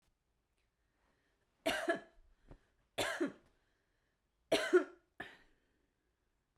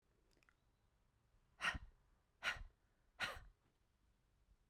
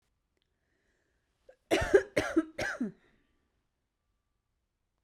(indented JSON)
{
  "three_cough_length": "6.6 s",
  "three_cough_amplitude": 4700,
  "three_cough_signal_mean_std_ratio": 0.28,
  "exhalation_length": "4.7 s",
  "exhalation_amplitude": 1445,
  "exhalation_signal_mean_std_ratio": 0.3,
  "cough_length": "5.0 s",
  "cough_amplitude": 11787,
  "cough_signal_mean_std_ratio": 0.27,
  "survey_phase": "beta (2021-08-13 to 2022-03-07)",
  "age": "18-44",
  "gender": "Female",
  "wearing_mask": "No",
  "symptom_sore_throat": true,
  "symptom_fatigue": true,
  "symptom_fever_high_temperature": true,
  "symptom_headache": true,
  "symptom_other": true,
  "smoker_status": "Current smoker (e-cigarettes or vapes only)",
  "respiratory_condition_asthma": false,
  "respiratory_condition_other": false,
  "recruitment_source": "Test and Trace",
  "submission_delay": "2 days",
  "covid_test_result": "Positive",
  "covid_test_method": "RT-qPCR",
  "covid_ct_value": 25.6,
  "covid_ct_gene": "ORF1ab gene"
}